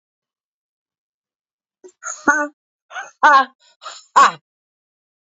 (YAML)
exhalation_length: 5.3 s
exhalation_amplitude: 27695
exhalation_signal_mean_std_ratio: 0.28
survey_phase: alpha (2021-03-01 to 2021-08-12)
age: 45-64
gender: Female
wearing_mask: 'No'
symptom_none: true
smoker_status: Never smoked
respiratory_condition_asthma: false
respiratory_condition_other: false
recruitment_source: REACT
submission_delay: 1 day
covid_test_result: Negative
covid_test_method: RT-qPCR